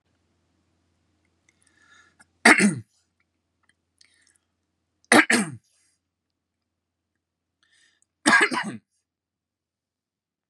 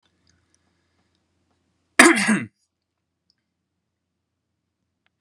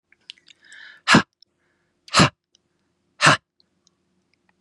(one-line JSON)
{"three_cough_length": "10.5 s", "three_cough_amplitude": 32635, "three_cough_signal_mean_std_ratio": 0.22, "cough_length": "5.2 s", "cough_amplitude": 32768, "cough_signal_mean_std_ratio": 0.2, "exhalation_length": "4.6 s", "exhalation_amplitude": 32274, "exhalation_signal_mean_std_ratio": 0.24, "survey_phase": "beta (2021-08-13 to 2022-03-07)", "age": "45-64", "gender": "Male", "wearing_mask": "No", "symptom_fatigue": true, "symptom_other": true, "symptom_onset": "3 days", "smoker_status": "Ex-smoker", "respiratory_condition_asthma": false, "respiratory_condition_other": false, "recruitment_source": "REACT", "submission_delay": "0 days", "covid_test_result": "Negative", "covid_test_method": "RT-qPCR", "influenza_a_test_result": "Negative", "influenza_b_test_result": "Negative"}